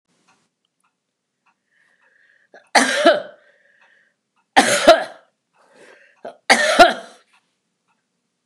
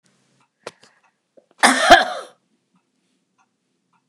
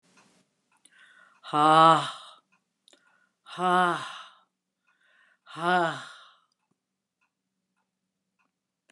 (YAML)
three_cough_length: 8.5 s
three_cough_amplitude: 29204
three_cough_signal_mean_std_ratio: 0.29
cough_length: 4.1 s
cough_amplitude: 29204
cough_signal_mean_std_ratio: 0.24
exhalation_length: 8.9 s
exhalation_amplitude: 17109
exhalation_signal_mean_std_ratio: 0.28
survey_phase: beta (2021-08-13 to 2022-03-07)
age: 65+
gender: Female
wearing_mask: 'No'
symptom_none: true
smoker_status: Never smoked
respiratory_condition_asthma: false
respiratory_condition_other: false
recruitment_source: REACT
submission_delay: 2 days
covid_test_result: Negative
covid_test_method: RT-qPCR
influenza_a_test_result: Negative
influenza_b_test_result: Negative